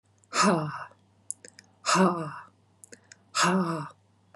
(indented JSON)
{
  "exhalation_length": "4.4 s",
  "exhalation_amplitude": 11533,
  "exhalation_signal_mean_std_ratio": 0.46,
  "survey_phase": "beta (2021-08-13 to 2022-03-07)",
  "age": "45-64",
  "gender": "Female",
  "wearing_mask": "No",
  "symptom_none": true,
  "smoker_status": "Never smoked",
  "respiratory_condition_asthma": false,
  "respiratory_condition_other": false,
  "recruitment_source": "REACT",
  "submission_delay": "5 days",
  "covid_test_result": "Negative",
  "covid_test_method": "RT-qPCR",
  "influenza_a_test_result": "Negative",
  "influenza_b_test_result": "Negative"
}